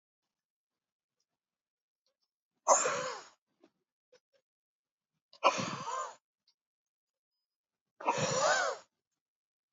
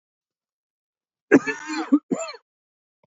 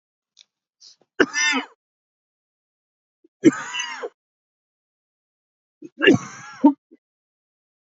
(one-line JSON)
{"exhalation_length": "9.7 s", "exhalation_amplitude": 9256, "exhalation_signal_mean_std_ratio": 0.31, "cough_length": "3.1 s", "cough_amplitude": 26619, "cough_signal_mean_std_ratio": 0.28, "three_cough_length": "7.9 s", "three_cough_amplitude": 28416, "three_cough_signal_mean_std_ratio": 0.25, "survey_phase": "beta (2021-08-13 to 2022-03-07)", "age": "45-64", "gender": "Male", "wearing_mask": "No", "symptom_cough_any": true, "symptom_fatigue": true, "symptom_headache": true, "symptom_onset": "4 days", "smoker_status": "Ex-smoker", "respiratory_condition_asthma": false, "respiratory_condition_other": false, "recruitment_source": "Test and Trace", "submission_delay": "2 days", "covid_test_result": "Positive", "covid_test_method": "RT-qPCR", "covid_ct_value": 19.6, "covid_ct_gene": "ORF1ab gene"}